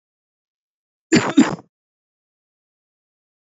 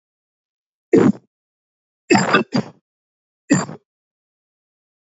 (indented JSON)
{
  "cough_length": "3.5 s",
  "cough_amplitude": 29948,
  "cough_signal_mean_std_ratio": 0.23,
  "three_cough_length": "5.0 s",
  "three_cough_amplitude": 28589,
  "three_cough_signal_mean_std_ratio": 0.3,
  "survey_phase": "beta (2021-08-13 to 2022-03-07)",
  "age": "45-64",
  "gender": "Male",
  "wearing_mask": "No",
  "symptom_runny_or_blocked_nose": true,
  "symptom_other": true,
  "smoker_status": "Never smoked",
  "respiratory_condition_asthma": false,
  "respiratory_condition_other": false,
  "recruitment_source": "Test and Trace",
  "submission_delay": "2 days",
  "covid_test_result": "Positive",
  "covid_test_method": "RT-qPCR",
  "covid_ct_value": 17.9,
  "covid_ct_gene": "ORF1ab gene",
  "covid_ct_mean": 18.5,
  "covid_viral_load": "840000 copies/ml",
  "covid_viral_load_category": "Low viral load (10K-1M copies/ml)"
}